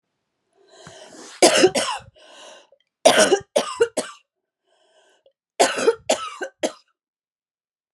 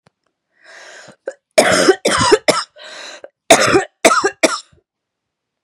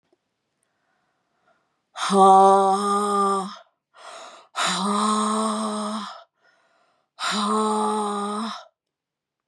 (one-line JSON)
{"three_cough_length": "7.9 s", "three_cough_amplitude": 32767, "three_cough_signal_mean_std_ratio": 0.35, "cough_length": "5.6 s", "cough_amplitude": 32768, "cough_signal_mean_std_ratio": 0.42, "exhalation_length": "9.5 s", "exhalation_amplitude": 21533, "exhalation_signal_mean_std_ratio": 0.55, "survey_phase": "beta (2021-08-13 to 2022-03-07)", "age": "45-64", "gender": "Female", "wearing_mask": "No", "symptom_cough_any": true, "symptom_runny_or_blocked_nose": true, "symptom_sore_throat": true, "symptom_headache": true, "symptom_onset": "5 days", "smoker_status": "Never smoked", "respiratory_condition_asthma": false, "respiratory_condition_other": false, "recruitment_source": "Test and Trace", "submission_delay": "0 days", "covid_test_result": "Positive", "covid_test_method": "ePCR"}